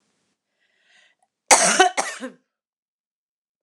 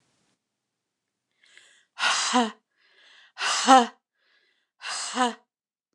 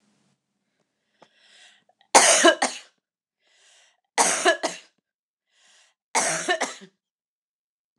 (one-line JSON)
{"cough_length": "3.6 s", "cough_amplitude": 29204, "cough_signal_mean_std_ratio": 0.28, "exhalation_length": "5.9 s", "exhalation_amplitude": 28949, "exhalation_signal_mean_std_ratio": 0.32, "three_cough_length": "8.0 s", "three_cough_amplitude": 29203, "three_cough_signal_mean_std_ratio": 0.31, "survey_phase": "beta (2021-08-13 to 2022-03-07)", "age": "45-64", "gender": "Female", "wearing_mask": "No", "symptom_sore_throat": true, "smoker_status": "Ex-smoker", "respiratory_condition_asthma": false, "respiratory_condition_other": false, "recruitment_source": "REACT", "submission_delay": "4 days", "covid_test_result": "Negative", "covid_test_method": "RT-qPCR"}